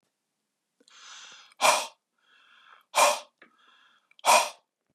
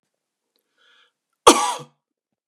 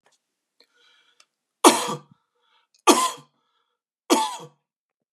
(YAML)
exhalation_length: 4.9 s
exhalation_amplitude: 14354
exhalation_signal_mean_std_ratio: 0.3
cough_length: 2.5 s
cough_amplitude: 32768
cough_signal_mean_std_ratio: 0.21
three_cough_length: 5.1 s
three_cough_amplitude: 32727
three_cough_signal_mean_std_ratio: 0.26
survey_phase: beta (2021-08-13 to 2022-03-07)
age: 45-64
gender: Male
wearing_mask: 'No'
symptom_none: true
smoker_status: Never smoked
respiratory_condition_asthma: false
respiratory_condition_other: false
recruitment_source: REACT
submission_delay: 0 days
covid_test_result: Negative
covid_test_method: RT-qPCR